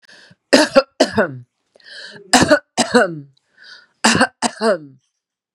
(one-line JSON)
{"three_cough_length": "5.5 s", "three_cough_amplitude": 32768, "three_cough_signal_mean_std_ratio": 0.41, "survey_phase": "beta (2021-08-13 to 2022-03-07)", "age": "45-64", "gender": "Female", "wearing_mask": "No", "symptom_headache": true, "smoker_status": "Ex-smoker", "respiratory_condition_asthma": false, "respiratory_condition_other": false, "recruitment_source": "REACT", "submission_delay": "1 day", "covid_test_result": "Negative", "covid_test_method": "RT-qPCR", "influenza_a_test_result": "Negative", "influenza_b_test_result": "Negative"}